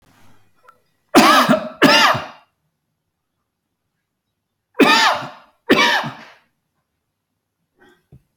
{
  "cough_length": "8.4 s",
  "cough_amplitude": 31790,
  "cough_signal_mean_std_ratio": 0.37,
  "survey_phase": "beta (2021-08-13 to 2022-03-07)",
  "age": "65+",
  "gender": "Male",
  "wearing_mask": "No",
  "symptom_none": true,
  "smoker_status": "Ex-smoker",
  "respiratory_condition_asthma": false,
  "respiratory_condition_other": false,
  "recruitment_source": "REACT",
  "submission_delay": "1 day",
  "covid_test_result": "Negative",
  "covid_test_method": "RT-qPCR"
}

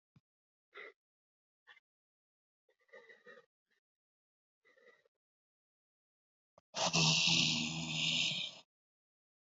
{
  "exhalation_length": "9.6 s",
  "exhalation_amplitude": 4663,
  "exhalation_signal_mean_std_ratio": 0.34,
  "survey_phase": "beta (2021-08-13 to 2022-03-07)",
  "age": "18-44",
  "gender": "Male",
  "wearing_mask": "No",
  "symptom_cough_any": true,
  "symptom_new_continuous_cough": true,
  "symptom_runny_or_blocked_nose": true,
  "symptom_sore_throat": true,
  "symptom_abdominal_pain": true,
  "symptom_fatigue": true,
  "symptom_headache": true,
  "symptom_change_to_sense_of_smell_or_taste": true,
  "symptom_loss_of_taste": true,
  "smoker_status": "Never smoked",
  "respiratory_condition_asthma": false,
  "respiratory_condition_other": false,
  "recruitment_source": "Test and Trace",
  "submission_delay": "1 day",
  "covid_test_result": "Positive",
  "covid_test_method": "RT-qPCR",
  "covid_ct_value": 17.4,
  "covid_ct_gene": "N gene",
  "covid_ct_mean": 18.2,
  "covid_viral_load": "1100000 copies/ml",
  "covid_viral_load_category": "High viral load (>1M copies/ml)"
}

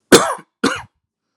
{
  "cough_length": "1.4 s",
  "cough_amplitude": 32768,
  "cough_signal_mean_std_ratio": 0.34,
  "survey_phase": "alpha (2021-03-01 to 2021-08-12)",
  "age": "18-44",
  "gender": "Male",
  "wearing_mask": "Yes",
  "symptom_cough_any": true,
  "symptom_onset": "18 days",
  "smoker_status": "Never smoked",
  "respiratory_condition_asthma": false,
  "respiratory_condition_other": false,
  "recruitment_source": "Test and Trace",
  "submission_delay": "2 days",
  "covid_test_result": "Positive",
  "covid_test_method": "ePCR"
}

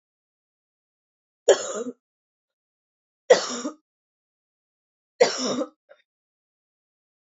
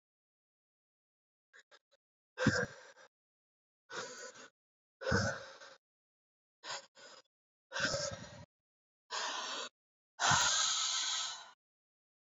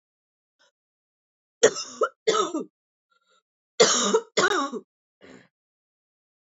{
  "three_cough_length": "7.3 s",
  "three_cough_amplitude": 25210,
  "three_cough_signal_mean_std_ratio": 0.23,
  "exhalation_length": "12.3 s",
  "exhalation_amplitude": 5084,
  "exhalation_signal_mean_std_ratio": 0.4,
  "cough_length": "6.5 s",
  "cough_amplitude": 22877,
  "cough_signal_mean_std_ratio": 0.34,
  "survey_phase": "beta (2021-08-13 to 2022-03-07)",
  "age": "18-44",
  "gender": "Female",
  "wearing_mask": "No",
  "symptom_cough_any": true,
  "symptom_runny_or_blocked_nose": true,
  "symptom_abdominal_pain": true,
  "symptom_diarrhoea": true,
  "symptom_fatigue": true,
  "symptom_fever_high_temperature": true,
  "symptom_headache": true,
  "symptom_change_to_sense_of_smell_or_taste": true,
  "symptom_loss_of_taste": true,
  "symptom_onset": "2 days",
  "smoker_status": "Never smoked",
  "respiratory_condition_asthma": false,
  "respiratory_condition_other": false,
  "recruitment_source": "Test and Trace",
  "submission_delay": "1 day",
  "covid_test_result": "Positive",
  "covid_test_method": "RT-qPCR",
  "covid_ct_value": 22.3,
  "covid_ct_gene": "ORF1ab gene"
}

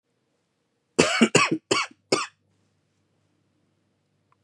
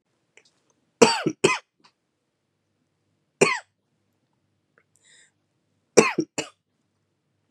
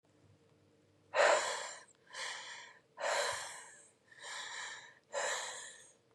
{
  "cough_length": "4.4 s",
  "cough_amplitude": 29343,
  "cough_signal_mean_std_ratio": 0.3,
  "three_cough_length": "7.5 s",
  "three_cough_amplitude": 32767,
  "three_cough_signal_mean_std_ratio": 0.21,
  "exhalation_length": "6.1 s",
  "exhalation_amplitude": 5095,
  "exhalation_signal_mean_std_ratio": 0.47,
  "survey_phase": "beta (2021-08-13 to 2022-03-07)",
  "age": "18-44",
  "gender": "Male",
  "wearing_mask": "No",
  "symptom_cough_any": true,
  "symptom_runny_or_blocked_nose": true,
  "symptom_shortness_of_breath": true,
  "symptom_sore_throat": true,
  "symptom_fatigue": true,
  "symptom_fever_high_temperature": true,
  "symptom_headache": true,
  "symptom_onset": "3 days",
  "smoker_status": "Current smoker (e-cigarettes or vapes only)",
  "respiratory_condition_asthma": false,
  "respiratory_condition_other": false,
  "recruitment_source": "Test and Trace",
  "submission_delay": "1 day",
  "covid_test_result": "Positive",
  "covid_test_method": "RT-qPCR",
  "covid_ct_value": 16.2,
  "covid_ct_gene": "ORF1ab gene",
  "covid_ct_mean": 16.5,
  "covid_viral_load": "3700000 copies/ml",
  "covid_viral_load_category": "High viral load (>1M copies/ml)"
}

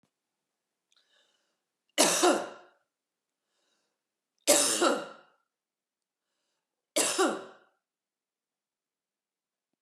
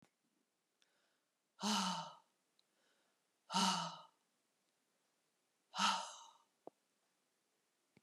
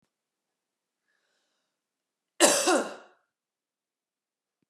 {
  "three_cough_length": "9.8 s",
  "three_cough_amplitude": 15950,
  "three_cough_signal_mean_std_ratio": 0.29,
  "exhalation_length": "8.0 s",
  "exhalation_amplitude": 2729,
  "exhalation_signal_mean_std_ratio": 0.31,
  "cough_length": "4.7 s",
  "cough_amplitude": 18153,
  "cough_signal_mean_std_ratio": 0.24,
  "survey_phase": "beta (2021-08-13 to 2022-03-07)",
  "age": "45-64",
  "gender": "Female",
  "wearing_mask": "No",
  "symptom_cough_any": true,
  "symptom_runny_or_blocked_nose": true,
  "symptom_sore_throat": true,
  "symptom_headache": true,
  "symptom_onset": "4 days",
  "smoker_status": "Ex-smoker",
  "respiratory_condition_asthma": false,
  "respiratory_condition_other": false,
  "recruitment_source": "Test and Trace",
  "submission_delay": "1 day",
  "covid_test_result": "Positive",
  "covid_test_method": "RT-qPCR",
  "covid_ct_value": 17.8,
  "covid_ct_gene": "ORF1ab gene"
}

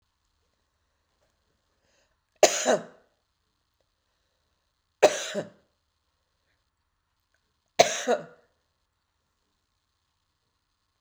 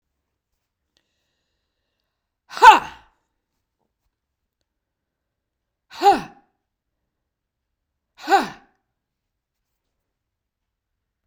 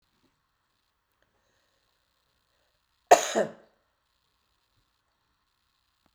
{
  "three_cough_length": "11.0 s",
  "three_cough_amplitude": 28129,
  "three_cough_signal_mean_std_ratio": 0.19,
  "exhalation_length": "11.3 s",
  "exhalation_amplitude": 32768,
  "exhalation_signal_mean_std_ratio": 0.16,
  "cough_length": "6.1 s",
  "cough_amplitude": 27141,
  "cough_signal_mean_std_ratio": 0.14,
  "survey_phase": "beta (2021-08-13 to 2022-03-07)",
  "age": "45-64",
  "gender": "Female",
  "wearing_mask": "No",
  "symptom_cough_any": true,
  "symptom_fatigue": true,
  "symptom_headache": true,
  "symptom_onset": "7 days",
  "smoker_status": "Never smoked",
  "respiratory_condition_asthma": false,
  "respiratory_condition_other": false,
  "recruitment_source": "REACT",
  "submission_delay": "1 day",
  "covid_test_result": "Negative",
  "covid_test_method": "RT-qPCR"
}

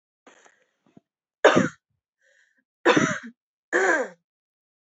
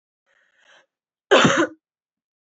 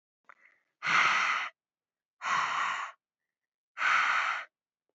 {
  "three_cough_length": "4.9 s",
  "three_cough_amplitude": 30339,
  "three_cough_signal_mean_std_ratio": 0.32,
  "cough_length": "2.6 s",
  "cough_amplitude": 30529,
  "cough_signal_mean_std_ratio": 0.3,
  "exhalation_length": "4.9 s",
  "exhalation_amplitude": 6755,
  "exhalation_signal_mean_std_ratio": 0.53,
  "survey_phase": "alpha (2021-03-01 to 2021-08-12)",
  "age": "18-44",
  "gender": "Female",
  "wearing_mask": "No",
  "symptom_abdominal_pain": true,
  "symptom_fatigue": true,
  "symptom_headache": true,
  "symptom_loss_of_taste": true,
  "smoker_status": "Never smoked",
  "respiratory_condition_asthma": false,
  "respiratory_condition_other": false,
  "recruitment_source": "Test and Trace",
  "submission_delay": "2 days",
  "covid_test_result": "Positive",
  "covid_test_method": "RT-qPCR",
  "covid_ct_value": 19.6,
  "covid_ct_gene": "ORF1ab gene",
  "covid_ct_mean": 20.0,
  "covid_viral_load": "290000 copies/ml",
  "covid_viral_load_category": "Low viral load (10K-1M copies/ml)"
}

